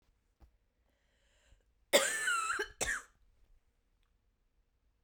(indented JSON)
{
  "cough_length": "5.0 s",
  "cough_amplitude": 8909,
  "cough_signal_mean_std_ratio": 0.33,
  "survey_phase": "beta (2021-08-13 to 2022-03-07)",
  "age": "45-64",
  "gender": "Female",
  "wearing_mask": "No",
  "symptom_cough_any": true,
  "symptom_new_continuous_cough": true,
  "symptom_runny_or_blocked_nose": true,
  "symptom_sore_throat": true,
  "symptom_fatigue": true,
  "symptom_headache": true,
  "symptom_other": true,
  "smoker_status": "Never smoked",
  "respiratory_condition_asthma": false,
  "respiratory_condition_other": false,
  "recruitment_source": "Test and Trace",
  "submission_delay": "1 day",
  "covid_test_result": "Positive",
  "covid_test_method": "RT-qPCR",
  "covid_ct_value": 27.3,
  "covid_ct_gene": "ORF1ab gene",
  "covid_ct_mean": 28.0,
  "covid_viral_load": "660 copies/ml",
  "covid_viral_load_category": "Minimal viral load (< 10K copies/ml)"
}